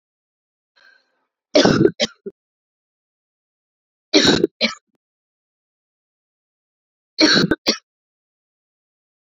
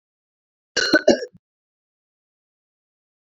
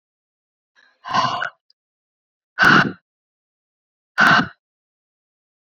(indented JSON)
{
  "three_cough_length": "9.4 s",
  "three_cough_amplitude": 32768,
  "three_cough_signal_mean_std_ratio": 0.28,
  "cough_length": "3.2 s",
  "cough_amplitude": 27117,
  "cough_signal_mean_std_ratio": 0.23,
  "exhalation_length": "5.6 s",
  "exhalation_amplitude": 30753,
  "exhalation_signal_mean_std_ratio": 0.31,
  "survey_phase": "beta (2021-08-13 to 2022-03-07)",
  "age": "45-64",
  "gender": "Female",
  "wearing_mask": "No",
  "symptom_runny_or_blocked_nose": true,
  "symptom_sore_throat": true,
  "symptom_headache": true,
  "smoker_status": "Never smoked",
  "respiratory_condition_asthma": false,
  "respiratory_condition_other": false,
  "recruitment_source": "Test and Trace",
  "submission_delay": "1 day",
  "covid_test_result": "Positive",
  "covid_test_method": "RT-qPCR",
  "covid_ct_value": 17.7,
  "covid_ct_gene": "ORF1ab gene",
  "covid_ct_mean": 18.2,
  "covid_viral_load": "1100000 copies/ml",
  "covid_viral_load_category": "High viral load (>1M copies/ml)"
}